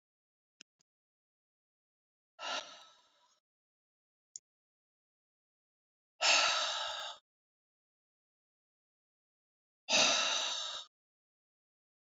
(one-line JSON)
{"exhalation_length": "12.0 s", "exhalation_amplitude": 5827, "exhalation_signal_mean_std_ratio": 0.3, "survey_phase": "alpha (2021-03-01 to 2021-08-12)", "age": "45-64", "gender": "Female", "wearing_mask": "No", "symptom_cough_any": true, "symptom_shortness_of_breath": true, "symptom_diarrhoea": true, "symptom_fatigue": true, "symptom_onset": "3 days", "smoker_status": "Ex-smoker", "respiratory_condition_asthma": false, "respiratory_condition_other": false, "recruitment_source": "Test and Trace", "submission_delay": "2 days", "covid_test_result": "Positive", "covid_test_method": "RT-qPCR", "covid_ct_value": 28.9, "covid_ct_gene": "ORF1ab gene", "covid_ct_mean": 29.8, "covid_viral_load": "170 copies/ml", "covid_viral_load_category": "Minimal viral load (< 10K copies/ml)"}